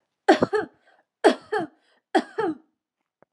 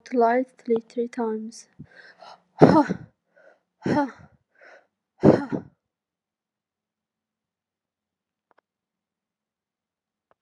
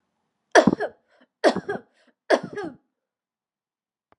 three_cough_length: 3.3 s
three_cough_amplitude: 25729
three_cough_signal_mean_std_ratio: 0.34
exhalation_length: 10.4 s
exhalation_amplitude: 32649
exhalation_signal_mean_std_ratio: 0.28
cough_length: 4.2 s
cough_amplitude: 28241
cough_signal_mean_std_ratio: 0.26
survey_phase: alpha (2021-03-01 to 2021-08-12)
age: 18-44
gender: Female
wearing_mask: 'No'
symptom_none: true
symptom_onset: 12 days
smoker_status: Never smoked
respiratory_condition_asthma: false
respiratory_condition_other: false
recruitment_source: REACT
submission_delay: 1 day
covid_test_result: Negative
covid_test_method: RT-qPCR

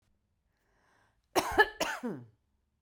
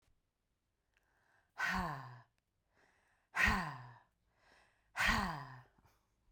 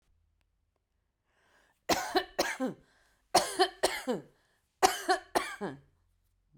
cough_length: 2.8 s
cough_amplitude: 12382
cough_signal_mean_std_ratio: 0.3
exhalation_length: 6.3 s
exhalation_amplitude: 3894
exhalation_signal_mean_std_ratio: 0.37
three_cough_length: 6.6 s
three_cough_amplitude: 14114
three_cough_signal_mean_std_ratio: 0.36
survey_phase: beta (2021-08-13 to 2022-03-07)
age: 45-64
gender: Female
wearing_mask: 'No'
symptom_none: true
smoker_status: Ex-smoker
respiratory_condition_asthma: false
respiratory_condition_other: false
recruitment_source: REACT
submission_delay: 2 days
covid_test_result: Negative
covid_test_method: RT-qPCR
influenza_a_test_result: Negative
influenza_b_test_result: Negative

